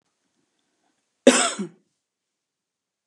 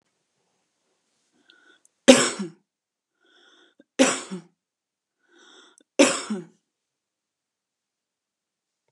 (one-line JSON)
{"cough_length": "3.1 s", "cough_amplitude": 29608, "cough_signal_mean_std_ratio": 0.21, "three_cough_length": "8.9 s", "three_cough_amplitude": 32767, "three_cough_signal_mean_std_ratio": 0.2, "survey_phase": "beta (2021-08-13 to 2022-03-07)", "age": "45-64", "gender": "Female", "wearing_mask": "No", "symptom_none": true, "smoker_status": "Ex-smoker", "respiratory_condition_asthma": true, "respiratory_condition_other": false, "recruitment_source": "REACT", "submission_delay": "0 days", "covid_test_result": "Negative", "covid_test_method": "RT-qPCR", "influenza_a_test_result": "Negative", "influenza_b_test_result": "Negative"}